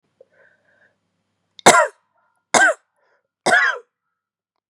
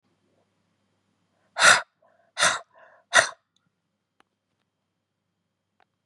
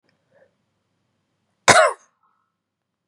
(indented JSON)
{
  "three_cough_length": "4.7 s",
  "three_cough_amplitude": 32768,
  "three_cough_signal_mean_std_ratio": 0.3,
  "exhalation_length": "6.1 s",
  "exhalation_amplitude": 29286,
  "exhalation_signal_mean_std_ratio": 0.22,
  "cough_length": "3.1 s",
  "cough_amplitude": 32768,
  "cough_signal_mean_std_ratio": 0.21,
  "survey_phase": "beta (2021-08-13 to 2022-03-07)",
  "age": "45-64",
  "gender": "Female",
  "wearing_mask": "Yes",
  "symptom_cough_any": true,
  "symptom_runny_or_blocked_nose": true,
  "symptom_fatigue": true,
  "symptom_fever_high_temperature": true,
  "symptom_headache": true,
  "symptom_change_to_sense_of_smell_or_taste": true,
  "symptom_onset": "5 days",
  "smoker_status": "Ex-smoker",
  "respiratory_condition_asthma": false,
  "respiratory_condition_other": false,
  "recruitment_source": "Test and Trace",
  "submission_delay": "2 days",
  "covid_test_result": "Positive",
  "covid_test_method": "RT-qPCR",
  "covid_ct_value": 22.6,
  "covid_ct_gene": "N gene"
}